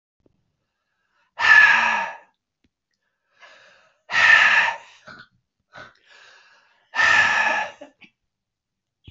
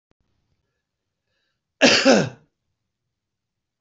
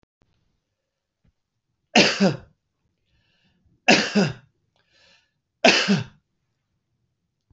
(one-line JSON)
{"exhalation_length": "9.1 s", "exhalation_amplitude": 25297, "exhalation_signal_mean_std_ratio": 0.38, "cough_length": "3.8 s", "cough_amplitude": 26237, "cough_signal_mean_std_ratio": 0.26, "three_cough_length": "7.5 s", "three_cough_amplitude": 25274, "three_cough_signal_mean_std_ratio": 0.29, "survey_phase": "beta (2021-08-13 to 2022-03-07)", "age": "45-64", "gender": "Male", "wearing_mask": "No", "symptom_none": true, "smoker_status": "Never smoked", "respiratory_condition_asthma": false, "respiratory_condition_other": false, "recruitment_source": "REACT", "submission_delay": "11 days", "covid_test_result": "Negative", "covid_test_method": "RT-qPCR", "influenza_a_test_result": "Negative", "influenza_b_test_result": "Negative"}